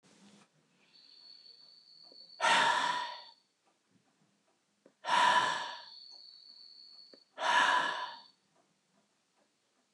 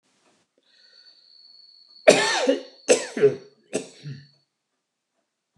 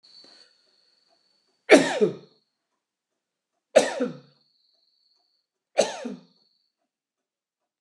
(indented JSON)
{
  "exhalation_length": "9.9 s",
  "exhalation_amplitude": 6003,
  "exhalation_signal_mean_std_ratio": 0.39,
  "cough_length": "5.6 s",
  "cough_amplitude": 29169,
  "cough_signal_mean_std_ratio": 0.3,
  "three_cough_length": "7.8 s",
  "three_cough_amplitude": 27354,
  "three_cough_signal_mean_std_ratio": 0.22,
  "survey_phase": "beta (2021-08-13 to 2022-03-07)",
  "age": "65+",
  "gender": "Male",
  "wearing_mask": "No",
  "symptom_runny_or_blocked_nose": true,
  "symptom_onset": "12 days",
  "smoker_status": "Ex-smoker",
  "respiratory_condition_asthma": false,
  "respiratory_condition_other": false,
  "recruitment_source": "REACT",
  "submission_delay": "2 days",
  "covid_test_result": "Negative",
  "covid_test_method": "RT-qPCR"
}